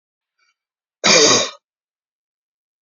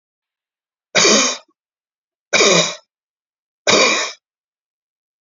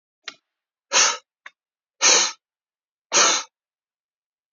{"cough_length": "2.8 s", "cough_amplitude": 30985, "cough_signal_mean_std_ratio": 0.32, "three_cough_length": "5.2 s", "three_cough_amplitude": 32008, "three_cough_signal_mean_std_ratio": 0.39, "exhalation_length": "4.5 s", "exhalation_amplitude": 24356, "exhalation_signal_mean_std_ratio": 0.33, "survey_phase": "beta (2021-08-13 to 2022-03-07)", "age": "45-64", "gender": "Male", "wearing_mask": "No", "symptom_none": true, "smoker_status": "Never smoked", "respiratory_condition_asthma": false, "respiratory_condition_other": false, "recruitment_source": "REACT", "submission_delay": "1 day", "covid_test_result": "Negative", "covid_test_method": "RT-qPCR", "influenza_a_test_result": "Negative", "influenza_b_test_result": "Negative"}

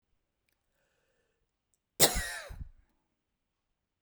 {"cough_length": "4.0 s", "cough_amplitude": 14991, "cough_signal_mean_std_ratio": 0.21, "survey_phase": "beta (2021-08-13 to 2022-03-07)", "age": "45-64", "gender": "Female", "wearing_mask": "No", "symptom_none": true, "smoker_status": "Never smoked", "respiratory_condition_asthma": false, "respiratory_condition_other": false, "recruitment_source": "REACT", "submission_delay": "1 day", "covid_test_result": "Negative", "covid_test_method": "RT-qPCR"}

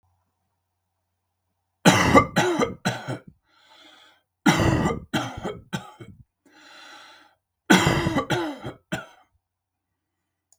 {"three_cough_length": "10.6 s", "three_cough_amplitude": 32766, "three_cough_signal_mean_std_ratio": 0.38, "survey_phase": "beta (2021-08-13 to 2022-03-07)", "age": "65+", "gender": "Male", "wearing_mask": "No", "symptom_none": true, "smoker_status": "Never smoked", "respiratory_condition_asthma": false, "respiratory_condition_other": false, "recruitment_source": "REACT", "submission_delay": "1 day", "covid_test_result": "Negative", "covid_test_method": "RT-qPCR"}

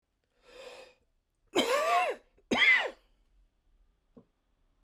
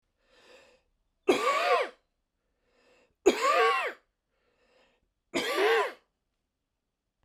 {"cough_length": "4.8 s", "cough_amplitude": 7035, "cough_signal_mean_std_ratio": 0.38, "three_cough_length": "7.2 s", "three_cough_amplitude": 11382, "three_cough_signal_mean_std_ratio": 0.4, "survey_phase": "beta (2021-08-13 to 2022-03-07)", "age": "45-64", "gender": "Male", "wearing_mask": "No", "symptom_fatigue": true, "symptom_onset": "12 days", "smoker_status": "Never smoked", "respiratory_condition_asthma": false, "respiratory_condition_other": false, "recruitment_source": "REACT", "submission_delay": "2 days", "covid_test_result": "Negative", "covid_test_method": "RT-qPCR", "influenza_a_test_result": "Unknown/Void", "influenza_b_test_result": "Unknown/Void"}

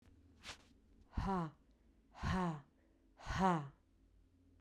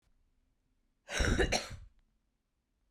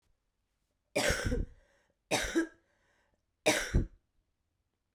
{"exhalation_length": "4.6 s", "exhalation_amplitude": 2841, "exhalation_signal_mean_std_ratio": 0.45, "cough_length": "2.9 s", "cough_amplitude": 5701, "cough_signal_mean_std_ratio": 0.35, "three_cough_length": "4.9 s", "three_cough_amplitude": 7653, "three_cough_signal_mean_std_ratio": 0.38, "survey_phase": "beta (2021-08-13 to 2022-03-07)", "age": "18-44", "gender": "Female", "wearing_mask": "No", "symptom_runny_or_blocked_nose": true, "symptom_change_to_sense_of_smell_or_taste": true, "symptom_loss_of_taste": true, "symptom_onset": "5 days", "smoker_status": "Current smoker (11 or more cigarettes per day)", "respiratory_condition_asthma": false, "respiratory_condition_other": false, "recruitment_source": "Test and Trace", "submission_delay": "1 day", "covid_test_result": "Positive", "covid_test_method": "ePCR"}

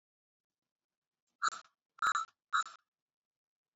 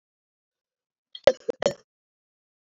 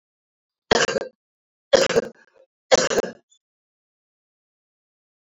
{"exhalation_length": "3.8 s", "exhalation_amplitude": 3298, "exhalation_signal_mean_std_ratio": 0.26, "cough_length": "2.7 s", "cough_amplitude": 28827, "cough_signal_mean_std_ratio": 0.15, "three_cough_length": "5.4 s", "three_cough_amplitude": 29250, "three_cough_signal_mean_std_ratio": 0.28, "survey_phase": "beta (2021-08-13 to 2022-03-07)", "age": "45-64", "gender": "Female", "wearing_mask": "No", "symptom_cough_any": true, "symptom_runny_or_blocked_nose": true, "symptom_fatigue": true, "smoker_status": "Current smoker (11 or more cigarettes per day)", "respiratory_condition_asthma": false, "respiratory_condition_other": false, "recruitment_source": "Test and Trace", "submission_delay": "1 day", "covid_test_result": "Positive", "covid_test_method": "LFT"}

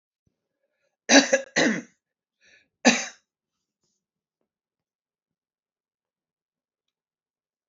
{"cough_length": "7.7 s", "cough_amplitude": 28146, "cough_signal_mean_std_ratio": 0.21, "survey_phase": "beta (2021-08-13 to 2022-03-07)", "age": "65+", "gender": "Female", "wearing_mask": "No", "symptom_none": true, "smoker_status": "Ex-smoker", "respiratory_condition_asthma": false, "respiratory_condition_other": false, "recruitment_source": "REACT", "submission_delay": "2 days", "covid_test_result": "Negative", "covid_test_method": "RT-qPCR", "influenza_a_test_result": "Negative", "influenza_b_test_result": "Negative"}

